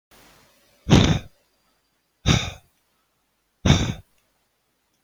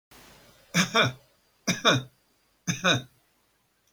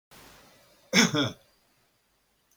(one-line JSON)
{"exhalation_length": "5.0 s", "exhalation_amplitude": 26630, "exhalation_signal_mean_std_ratio": 0.3, "three_cough_length": "3.9 s", "three_cough_amplitude": 15945, "three_cough_signal_mean_std_ratio": 0.37, "cough_length": "2.6 s", "cough_amplitude": 16967, "cough_signal_mean_std_ratio": 0.3, "survey_phase": "beta (2021-08-13 to 2022-03-07)", "age": "65+", "gender": "Male", "wearing_mask": "No", "symptom_none": true, "smoker_status": "Never smoked", "respiratory_condition_asthma": false, "respiratory_condition_other": false, "recruitment_source": "REACT", "submission_delay": "2 days", "covid_test_result": "Negative", "covid_test_method": "RT-qPCR"}